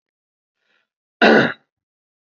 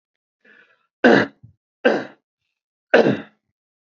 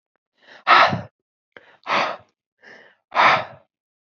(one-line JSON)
{"cough_length": "2.2 s", "cough_amplitude": 32768, "cough_signal_mean_std_ratio": 0.28, "three_cough_length": "3.9 s", "three_cough_amplitude": 27783, "three_cough_signal_mean_std_ratio": 0.3, "exhalation_length": "4.1 s", "exhalation_amplitude": 30067, "exhalation_signal_mean_std_ratio": 0.35, "survey_phase": "beta (2021-08-13 to 2022-03-07)", "age": "18-44", "gender": "Male", "wearing_mask": "No", "symptom_none": true, "smoker_status": "Never smoked", "respiratory_condition_asthma": true, "respiratory_condition_other": false, "recruitment_source": "REACT", "submission_delay": "3 days", "covid_test_result": "Negative", "covid_test_method": "RT-qPCR", "influenza_a_test_result": "Negative", "influenza_b_test_result": "Negative"}